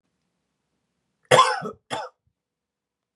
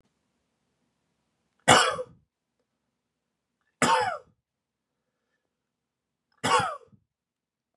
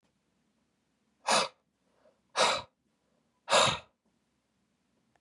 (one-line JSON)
{"cough_length": "3.2 s", "cough_amplitude": 30247, "cough_signal_mean_std_ratio": 0.25, "three_cough_length": "7.8 s", "three_cough_amplitude": 24111, "three_cough_signal_mean_std_ratio": 0.25, "exhalation_length": "5.2 s", "exhalation_amplitude": 8733, "exhalation_signal_mean_std_ratio": 0.29, "survey_phase": "beta (2021-08-13 to 2022-03-07)", "age": "18-44", "gender": "Male", "wearing_mask": "No", "symptom_none": true, "smoker_status": "Never smoked", "respiratory_condition_asthma": false, "respiratory_condition_other": false, "recruitment_source": "REACT", "submission_delay": "1 day", "covid_test_result": "Negative", "covid_test_method": "RT-qPCR", "influenza_a_test_result": "Unknown/Void", "influenza_b_test_result": "Unknown/Void"}